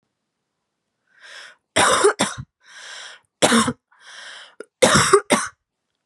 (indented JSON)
{
  "three_cough_length": "6.1 s",
  "three_cough_amplitude": 32767,
  "three_cough_signal_mean_std_ratio": 0.39,
  "survey_phase": "beta (2021-08-13 to 2022-03-07)",
  "age": "18-44",
  "gender": "Female",
  "wearing_mask": "No",
  "symptom_cough_any": true,
  "symptom_sore_throat": true,
  "smoker_status": "Never smoked",
  "respiratory_condition_asthma": true,
  "respiratory_condition_other": false,
  "recruitment_source": "REACT",
  "submission_delay": "2 days",
  "covid_test_result": "Negative",
  "covid_test_method": "RT-qPCR",
  "influenza_a_test_result": "Negative",
  "influenza_b_test_result": "Negative"
}